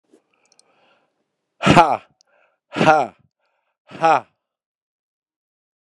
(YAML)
exhalation_length: 5.8 s
exhalation_amplitude: 32768
exhalation_signal_mean_std_ratio: 0.27
survey_phase: beta (2021-08-13 to 2022-03-07)
age: 45-64
gender: Male
wearing_mask: 'No'
symptom_cough_any: true
symptom_runny_or_blocked_nose: true
symptom_fatigue: true
symptom_fever_high_temperature: true
symptom_onset: 2 days
smoker_status: Current smoker (11 or more cigarettes per day)
respiratory_condition_asthma: false
respiratory_condition_other: false
recruitment_source: Test and Trace
submission_delay: 2 days
covid_test_result: Positive
covid_test_method: RT-qPCR
covid_ct_value: 27.2
covid_ct_gene: N gene